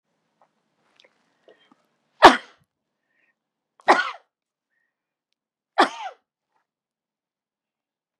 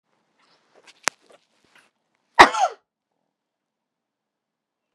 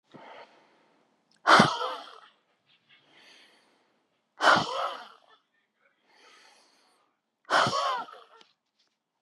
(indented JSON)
{
  "three_cough_length": "8.2 s",
  "three_cough_amplitude": 32768,
  "three_cough_signal_mean_std_ratio": 0.16,
  "cough_length": "4.9 s",
  "cough_amplitude": 32768,
  "cough_signal_mean_std_ratio": 0.14,
  "exhalation_length": "9.2 s",
  "exhalation_amplitude": 23164,
  "exhalation_signal_mean_std_ratio": 0.29,
  "survey_phase": "beta (2021-08-13 to 2022-03-07)",
  "age": "65+",
  "gender": "Female",
  "wearing_mask": "No",
  "symptom_none": true,
  "smoker_status": "Ex-smoker",
  "respiratory_condition_asthma": false,
  "respiratory_condition_other": false,
  "recruitment_source": "REACT",
  "submission_delay": "2 days",
  "covid_test_result": "Negative",
  "covid_test_method": "RT-qPCR",
  "influenza_a_test_result": "Negative",
  "influenza_b_test_result": "Negative"
}